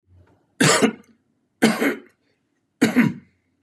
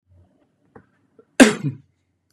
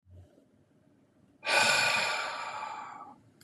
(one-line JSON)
{"three_cough_length": "3.6 s", "three_cough_amplitude": 23225, "three_cough_signal_mean_std_ratio": 0.4, "cough_length": "2.3 s", "cough_amplitude": 32768, "cough_signal_mean_std_ratio": 0.21, "exhalation_length": "3.4 s", "exhalation_amplitude": 8523, "exhalation_signal_mean_std_ratio": 0.52, "survey_phase": "beta (2021-08-13 to 2022-03-07)", "age": "45-64", "gender": "Male", "wearing_mask": "No", "symptom_none": true, "smoker_status": "Never smoked", "respiratory_condition_asthma": false, "respiratory_condition_other": false, "recruitment_source": "REACT", "submission_delay": "2 days", "covid_test_result": "Negative", "covid_test_method": "RT-qPCR", "influenza_a_test_result": "Negative", "influenza_b_test_result": "Negative"}